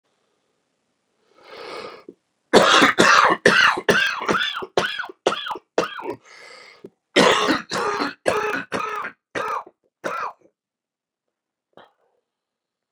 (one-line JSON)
{"cough_length": "12.9 s", "cough_amplitude": 32768, "cough_signal_mean_std_ratio": 0.43, "survey_phase": "beta (2021-08-13 to 2022-03-07)", "age": "65+", "gender": "Male", "wearing_mask": "No", "symptom_cough_any": true, "symptom_new_continuous_cough": true, "symptom_runny_or_blocked_nose": true, "symptom_shortness_of_breath": true, "symptom_sore_throat": true, "symptom_abdominal_pain": true, "symptom_fatigue": true, "symptom_headache": true, "symptom_change_to_sense_of_smell_or_taste": true, "symptom_loss_of_taste": true, "symptom_onset": "3 days", "smoker_status": "Ex-smoker", "respiratory_condition_asthma": false, "respiratory_condition_other": true, "recruitment_source": "Test and Trace", "submission_delay": "2 days", "covid_test_result": "Positive", "covid_test_method": "ePCR"}